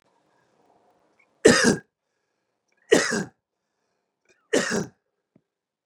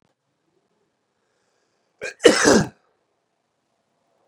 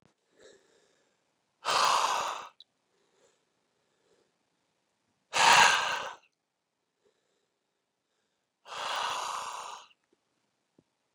{"three_cough_length": "5.9 s", "three_cough_amplitude": 28634, "three_cough_signal_mean_std_ratio": 0.27, "cough_length": "4.3 s", "cough_amplitude": 32768, "cough_signal_mean_std_ratio": 0.23, "exhalation_length": "11.1 s", "exhalation_amplitude": 16172, "exhalation_signal_mean_std_ratio": 0.31, "survey_phase": "beta (2021-08-13 to 2022-03-07)", "age": "45-64", "gender": "Male", "wearing_mask": "No", "symptom_change_to_sense_of_smell_or_taste": true, "symptom_onset": "6 days", "smoker_status": "Never smoked", "respiratory_condition_asthma": true, "respiratory_condition_other": false, "recruitment_source": "Test and Trace", "submission_delay": "2 days", "covid_test_result": "Positive", "covid_test_method": "RT-qPCR"}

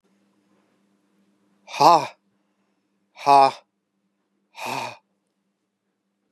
{"exhalation_length": "6.3 s", "exhalation_amplitude": 31319, "exhalation_signal_mean_std_ratio": 0.24, "survey_phase": "beta (2021-08-13 to 2022-03-07)", "age": "45-64", "gender": "Male", "wearing_mask": "No", "symptom_runny_or_blocked_nose": true, "smoker_status": "Never smoked", "respiratory_condition_asthma": false, "respiratory_condition_other": false, "recruitment_source": "REACT", "submission_delay": "3 days", "covid_test_result": "Negative", "covid_test_method": "RT-qPCR", "influenza_a_test_result": "Negative", "influenza_b_test_result": "Negative"}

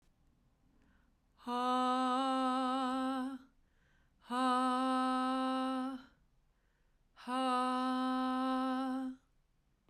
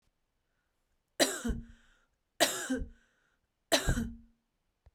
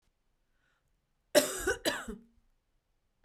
{"exhalation_length": "9.9 s", "exhalation_amplitude": 2783, "exhalation_signal_mean_std_ratio": 0.79, "three_cough_length": "4.9 s", "three_cough_amplitude": 10527, "three_cough_signal_mean_std_ratio": 0.35, "cough_length": "3.2 s", "cough_amplitude": 11760, "cough_signal_mean_std_ratio": 0.29, "survey_phase": "beta (2021-08-13 to 2022-03-07)", "age": "45-64", "gender": "Female", "wearing_mask": "No", "symptom_none": true, "smoker_status": "Ex-smoker", "respiratory_condition_asthma": false, "respiratory_condition_other": false, "recruitment_source": "REACT", "submission_delay": "1 day", "covid_test_result": "Negative", "covid_test_method": "RT-qPCR"}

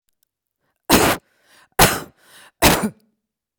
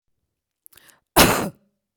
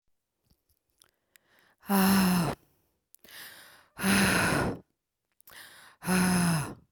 {"three_cough_length": "3.6 s", "three_cough_amplitude": 32768, "three_cough_signal_mean_std_ratio": 0.35, "cough_length": "2.0 s", "cough_amplitude": 31417, "cough_signal_mean_std_ratio": 0.29, "exhalation_length": "6.9 s", "exhalation_amplitude": 9366, "exhalation_signal_mean_std_ratio": 0.5, "survey_phase": "beta (2021-08-13 to 2022-03-07)", "age": "18-44", "gender": "Female", "wearing_mask": "No", "symptom_none": true, "smoker_status": "Never smoked", "respiratory_condition_asthma": false, "respiratory_condition_other": false, "recruitment_source": "REACT", "submission_delay": "1 day", "covid_test_result": "Negative", "covid_test_method": "RT-qPCR"}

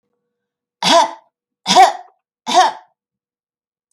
{"three_cough_length": "3.9 s", "three_cough_amplitude": 32768, "three_cough_signal_mean_std_ratio": 0.35, "survey_phase": "alpha (2021-03-01 to 2021-08-12)", "age": "65+", "gender": "Female", "wearing_mask": "No", "symptom_none": true, "smoker_status": "Never smoked", "respiratory_condition_asthma": false, "respiratory_condition_other": false, "recruitment_source": "REACT", "submission_delay": "3 days", "covid_test_result": "Negative", "covid_test_method": "RT-qPCR"}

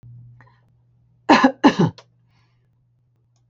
{"cough_length": "3.5 s", "cough_amplitude": 28052, "cough_signal_mean_std_ratio": 0.28, "survey_phase": "beta (2021-08-13 to 2022-03-07)", "age": "65+", "gender": "Female", "wearing_mask": "No", "symptom_none": true, "smoker_status": "Ex-smoker", "respiratory_condition_asthma": false, "respiratory_condition_other": false, "recruitment_source": "REACT", "submission_delay": "1 day", "covid_test_result": "Negative", "covid_test_method": "RT-qPCR"}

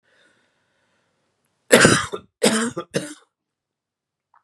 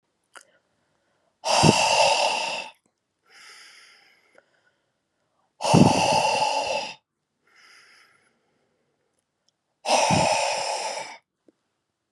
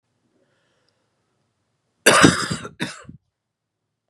{"three_cough_length": "4.4 s", "three_cough_amplitude": 32768, "three_cough_signal_mean_std_ratio": 0.29, "exhalation_length": "12.1 s", "exhalation_amplitude": 29142, "exhalation_signal_mean_std_ratio": 0.43, "cough_length": "4.1 s", "cough_amplitude": 32768, "cough_signal_mean_std_ratio": 0.26, "survey_phase": "beta (2021-08-13 to 2022-03-07)", "age": "18-44", "gender": "Male", "wearing_mask": "No", "symptom_cough_any": true, "symptom_runny_or_blocked_nose": true, "symptom_sore_throat": true, "symptom_fatigue": true, "symptom_headache": true, "smoker_status": "Ex-smoker", "respiratory_condition_asthma": false, "respiratory_condition_other": false, "recruitment_source": "Test and Trace", "submission_delay": "3 days", "covid_test_result": "Positive", "covid_test_method": "RT-qPCR", "covid_ct_value": 21.6, "covid_ct_gene": "ORF1ab gene"}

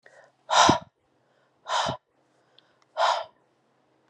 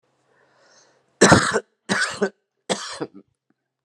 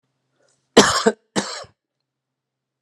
{"exhalation_length": "4.1 s", "exhalation_amplitude": 19072, "exhalation_signal_mean_std_ratio": 0.34, "three_cough_length": "3.8 s", "three_cough_amplitude": 32768, "three_cough_signal_mean_std_ratio": 0.33, "cough_length": "2.8 s", "cough_amplitude": 32768, "cough_signal_mean_std_ratio": 0.27, "survey_phase": "alpha (2021-03-01 to 2021-08-12)", "age": "45-64", "gender": "Male", "wearing_mask": "No", "symptom_none": true, "smoker_status": "Ex-smoker", "respiratory_condition_asthma": false, "respiratory_condition_other": false, "recruitment_source": "REACT", "submission_delay": "2 days", "covid_test_result": "Negative", "covid_test_method": "RT-qPCR"}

